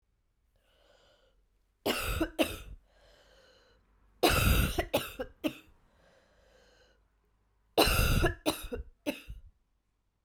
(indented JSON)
{
  "three_cough_length": "10.2 s",
  "three_cough_amplitude": 11515,
  "three_cough_signal_mean_std_ratio": 0.38,
  "survey_phase": "beta (2021-08-13 to 2022-03-07)",
  "age": "18-44",
  "gender": "Female",
  "wearing_mask": "No",
  "symptom_cough_any": true,
  "symptom_runny_or_blocked_nose": true,
  "symptom_onset": "3 days",
  "smoker_status": "Never smoked",
  "respiratory_condition_asthma": false,
  "respiratory_condition_other": false,
  "recruitment_source": "Test and Trace",
  "submission_delay": "2 days",
  "covid_test_result": "Positive",
  "covid_test_method": "RT-qPCR",
  "covid_ct_value": 17.7,
  "covid_ct_gene": "ORF1ab gene"
}